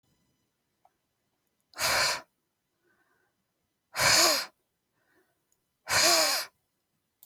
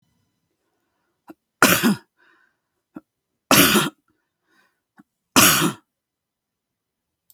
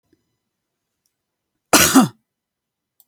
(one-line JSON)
{"exhalation_length": "7.3 s", "exhalation_amplitude": 11980, "exhalation_signal_mean_std_ratio": 0.36, "three_cough_length": "7.3 s", "three_cough_amplitude": 32768, "three_cough_signal_mean_std_ratio": 0.29, "cough_length": "3.1 s", "cough_amplitude": 32768, "cough_signal_mean_std_ratio": 0.25, "survey_phase": "beta (2021-08-13 to 2022-03-07)", "age": "45-64", "gender": "Female", "wearing_mask": "No", "symptom_none": true, "smoker_status": "Ex-smoker", "respiratory_condition_asthma": false, "respiratory_condition_other": true, "recruitment_source": "REACT", "submission_delay": "0 days", "covid_test_result": "Negative", "covid_test_method": "RT-qPCR", "influenza_a_test_result": "Negative", "influenza_b_test_result": "Negative"}